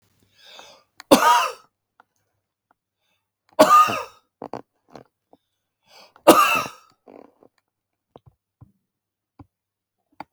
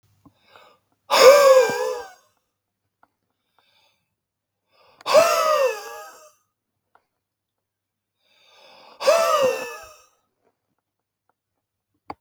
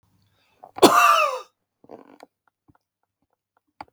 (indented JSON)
{
  "three_cough_length": "10.3 s",
  "three_cough_amplitude": 32768,
  "three_cough_signal_mean_std_ratio": 0.26,
  "exhalation_length": "12.2 s",
  "exhalation_amplitude": 32768,
  "exhalation_signal_mean_std_ratio": 0.32,
  "cough_length": "3.9 s",
  "cough_amplitude": 32768,
  "cough_signal_mean_std_ratio": 0.29,
  "survey_phase": "beta (2021-08-13 to 2022-03-07)",
  "age": "45-64",
  "gender": "Male",
  "wearing_mask": "No",
  "symptom_none": true,
  "smoker_status": "Never smoked",
  "respiratory_condition_asthma": false,
  "respiratory_condition_other": false,
  "recruitment_source": "REACT",
  "submission_delay": "3 days",
  "covid_test_result": "Negative",
  "covid_test_method": "RT-qPCR",
  "influenza_a_test_result": "Negative",
  "influenza_b_test_result": "Negative"
}